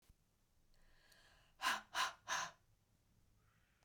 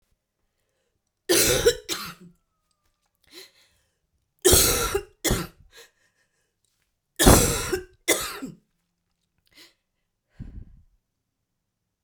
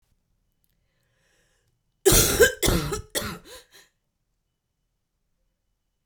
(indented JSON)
{
  "exhalation_length": "3.8 s",
  "exhalation_amplitude": 1537,
  "exhalation_signal_mean_std_ratio": 0.34,
  "three_cough_length": "12.0 s",
  "three_cough_amplitude": 32767,
  "three_cough_signal_mean_std_ratio": 0.31,
  "cough_length": "6.1 s",
  "cough_amplitude": 22802,
  "cough_signal_mean_std_ratio": 0.29,
  "survey_phase": "beta (2021-08-13 to 2022-03-07)",
  "age": "18-44",
  "gender": "Female",
  "wearing_mask": "No",
  "symptom_cough_any": true,
  "symptom_runny_or_blocked_nose": true,
  "symptom_shortness_of_breath": true,
  "symptom_sore_throat": true,
  "symptom_fatigue": true,
  "symptom_fever_high_temperature": true,
  "symptom_headache": true,
  "symptom_change_to_sense_of_smell_or_taste": true,
  "symptom_onset": "4 days",
  "smoker_status": "Current smoker (1 to 10 cigarettes per day)",
  "respiratory_condition_asthma": false,
  "respiratory_condition_other": false,
  "recruitment_source": "Test and Trace",
  "submission_delay": "2 days",
  "covid_test_result": "Positive",
  "covid_test_method": "RT-qPCR"
}